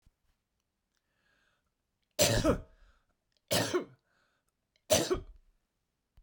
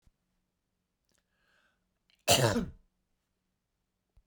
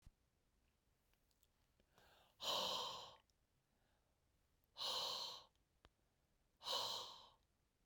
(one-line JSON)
{"three_cough_length": "6.2 s", "three_cough_amplitude": 10594, "three_cough_signal_mean_std_ratio": 0.31, "cough_length": "4.3 s", "cough_amplitude": 10452, "cough_signal_mean_std_ratio": 0.23, "exhalation_length": "7.9 s", "exhalation_amplitude": 1022, "exhalation_signal_mean_std_ratio": 0.41, "survey_phase": "beta (2021-08-13 to 2022-03-07)", "age": "45-64", "gender": "Female", "wearing_mask": "No", "symptom_none": true, "smoker_status": "Never smoked", "respiratory_condition_asthma": false, "respiratory_condition_other": false, "recruitment_source": "REACT", "submission_delay": "1 day", "covid_test_result": "Negative", "covid_test_method": "RT-qPCR"}